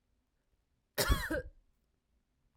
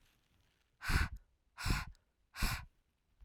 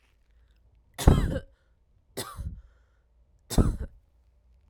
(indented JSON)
{
  "cough_length": "2.6 s",
  "cough_amplitude": 5347,
  "cough_signal_mean_std_ratio": 0.31,
  "exhalation_length": "3.2 s",
  "exhalation_amplitude": 3905,
  "exhalation_signal_mean_std_ratio": 0.39,
  "three_cough_length": "4.7 s",
  "three_cough_amplitude": 26431,
  "three_cough_signal_mean_std_ratio": 0.28,
  "survey_phase": "alpha (2021-03-01 to 2021-08-12)",
  "age": "18-44",
  "gender": "Female",
  "wearing_mask": "No",
  "symptom_none": true,
  "smoker_status": "Never smoked",
  "respiratory_condition_asthma": false,
  "respiratory_condition_other": false,
  "recruitment_source": "REACT",
  "submission_delay": "1 day",
  "covid_test_result": "Negative",
  "covid_test_method": "RT-qPCR"
}